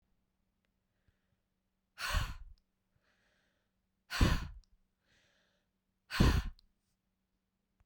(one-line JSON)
{"exhalation_length": "7.9 s", "exhalation_amplitude": 6806, "exhalation_signal_mean_std_ratio": 0.27, "survey_phase": "beta (2021-08-13 to 2022-03-07)", "age": "45-64", "gender": "Female", "wearing_mask": "No", "symptom_fatigue": true, "smoker_status": "Never smoked", "respiratory_condition_asthma": false, "respiratory_condition_other": false, "recruitment_source": "REACT", "submission_delay": "2 days", "covid_test_result": "Negative", "covid_test_method": "RT-qPCR"}